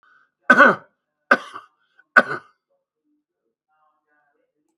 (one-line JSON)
{"three_cough_length": "4.8 s", "three_cough_amplitude": 32768, "three_cough_signal_mean_std_ratio": 0.22, "survey_phase": "beta (2021-08-13 to 2022-03-07)", "age": "65+", "gender": "Male", "wearing_mask": "No", "symptom_cough_any": true, "symptom_fatigue": true, "symptom_onset": "12 days", "smoker_status": "Never smoked", "respiratory_condition_asthma": false, "respiratory_condition_other": false, "recruitment_source": "REACT", "submission_delay": "2 days", "covid_test_result": "Negative", "covid_test_method": "RT-qPCR", "influenza_a_test_result": "Negative", "influenza_b_test_result": "Negative"}